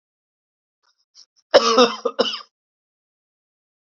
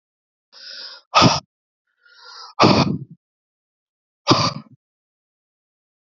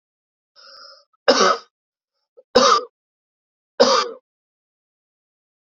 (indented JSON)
{
  "cough_length": "3.9 s",
  "cough_amplitude": 31810,
  "cough_signal_mean_std_ratio": 0.27,
  "exhalation_length": "6.1 s",
  "exhalation_amplitude": 32307,
  "exhalation_signal_mean_std_ratio": 0.31,
  "three_cough_length": "5.7 s",
  "three_cough_amplitude": 31810,
  "three_cough_signal_mean_std_ratio": 0.3,
  "survey_phase": "beta (2021-08-13 to 2022-03-07)",
  "age": "45-64",
  "gender": "Male",
  "wearing_mask": "No",
  "symptom_cough_any": true,
  "symptom_shortness_of_breath": true,
  "symptom_fatigue": true,
  "symptom_fever_high_temperature": true,
  "symptom_headache": true,
  "symptom_other": true,
  "symptom_onset": "3 days",
  "smoker_status": "Ex-smoker",
  "respiratory_condition_asthma": false,
  "respiratory_condition_other": false,
  "recruitment_source": "Test and Trace",
  "submission_delay": "1 day",
  "covid_test_result": "Positive",
  "covid_test_method": "RT-qPCR",
  "covid_ct_value": 21.3,
  "covid_ct_gene": "N gene"
}